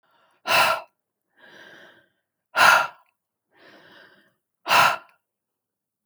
{"exhalation_length": "6.1 s", "exhalation_amplitude": 26085, "exhalation_signal_mean_std_ratio": 0.31, "survey_phase": "beta (2021-08-13 to 2022-03-07)", "age": "45-64", "gender": "Female", "wearing_mask": "No", "symptom_none": true, "smoker_status": "Never smoked", "respiratory_condition_asthma": false, "respiratory_condition_other": false, "recruitment_source": "REACT", "submission_delay": "1 day", "covid_test_result": "Negative", "covid_test_method": "RT-qPCR"}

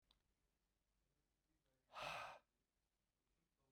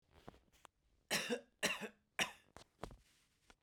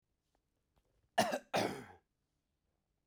{"exhalation_length": "3.7 s", "exhalation_amplitude": 414, "exhalation_signal_mean_std_ratio": 0.3, "three_cough_length": "3.6 s", "three_cough_amplitude": 2531, "three_cough_signal_mean_std_ratio": 0.35, "cough_length": "3.1 s", "cough_amplitude": 3635, "cough_signal_mean_std_ratio": 0.29, "survey_phase": "beta (2021-08-13 to 2022-03-07)", "age": "45-64", "gender": "Male", "wearing_mask": "No", "symptom_none": true, "smoker_status": "Never smoked", "respiratory_condition_asthma": false, "respiratory_condition_other": false, "recruitment_source": "REACT", "submission_delay": "5 days", "covid_test_result": "Negative", "covid_test_method": "RT-qPCR"}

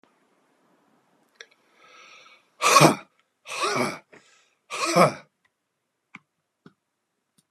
{"exhalation_length": "7.5 s", "exhalation_amplitude": 31527, "exhalation_signal_mean_std_ratio": 0.27, "survey_phase": "beta (2021-08-13 to 2022-03-07)", "age": "45-64", "gender": "Male", "wearing_mask": "No", "symptom_none": true, "smoker_status": "Current smoker (1 to 10 cigarettes per day)", "respiratory_condition_asthma": false, "respiratory_condition_other": false, "recruitment_source": "REACT", "submission_delay": "6 days", "covid_test_result": "Negative", "covid_test_method": "RT-qPCR"}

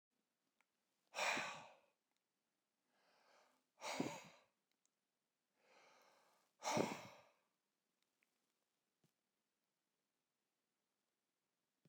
{"exhalation_length": "11.9 s", "exhalation_amplitude": 2261, "exhalation_signal_mean_std_ratio": 0.25, "survey_phase": "beta (2021-08-13 to 2022-03-07)", "age": "45-64", "gender": "Male", "wearing_mask": "No", "symptom_none": true, "smoker_status": "Never smoked", "respiratory_condition_asthma": false, "respiratory_condition_other": false, "recruitment_source": "REACT", "submission_delay": "1 day", "covid_test_result": "Negative", "covid_test_method": "RT-qPCR"}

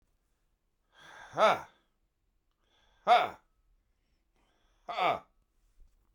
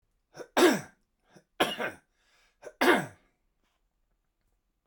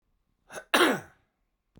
{"exhalation_length": "6.1 s", "exhalation_amplitude": 7919, "exhalation_signal_mean_std_ratio": 0.26, "three_cough_length": "4.9 s", "three_cough_amplitude": 11307, "three_cough_signal_mean_std_ratio": 0.3, "cough_length": "1.8 s", "cough_amplitude": 15419, "cough_signal_mean_std_ratio": 0.31, "survey_phase": "beta (2021-08-13 to 2022-03-07)", "age": "45-64", "gender": "Male", "wearing_mask": "No", "symptom_none": true, "smoker_status": "Ex-smoker", "respiratory_condition_asthma": false, "respiratory_condition_other": false, "recruitment_source": "REACT", "submission_delay": "2 days", "covid_test_result": "Negative", "covid_test_method": "RT-qPCR"}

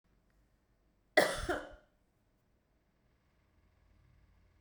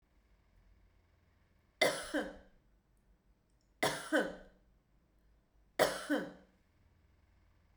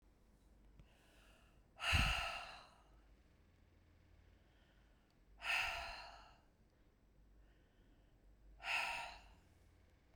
{"cough_length": "4.6 s", "cough_amplitude": 8329, "cough_signal_mean_std_ratio": 0.21, "three_cough_length": "7.8 s", "three_cough_amplitude": 6622, "three_cough_signal_mean_std_ratio": 0.31, "exhalation_length": "10.2 s", "exhalation_amplitude": 2657, "exhalation_signal_mean_std_ratio": 0.38, "survey_phase": "beta (2021-08-13 to 2022-03-07)", "age": "45-64", "gender": "Female", "wearing_mask": "No", "symptom_none": true, "smoker_status": "Never smoked", "respiratory_condition_asthma": false, "respiratory_condition_other": false, "recruitment_source": "REACT", "submission_delay": "0 days", "covid_test_result": "Negative", "covid_test_method": "RT-qPCR"}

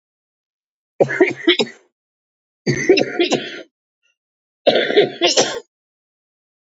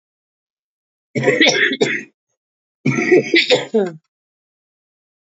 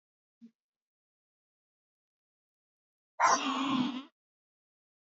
{"three_cough_length": "6.7 s", "three_cough_amplitude": 30140, "three_cough_signal_mean_std_ratio": 0.41, "cough_length": "5.3 s", "cough_amplitude": 29837, "cough_signal_mean_std_ratio": 0.44, "exhalation_length": "5.1 s", "exhalation_amplitude": 7686, "exhalation_signal_mean_std_ratio": 0.3, "survey_phase": "beta (2021-08-13 to 2022-03-07)", "age": "45-64", "gender": "Female", "wearing_mask": "No", "symptom_cough_any": true, "symptom_runny_or_blocked_nose": true, "symptom_shortness_of_breath": true, "symptom_sore_throat": true, "symptom_fatigue": true, "symptom_onset": "8 days", "smoker_status": "Current smoker (11 or more cigarettes per day)", "respiratory_condition_asthma": true, "respiratory_condition_other": false, "recruitment_source": "REACT", "submission_delay": "3 days", "covid_test_result": "Negative", "covid_test_method": "RT-qPCR", "influenza_a_test_result": "Negative", "influenza_b_test_result": "Negative"}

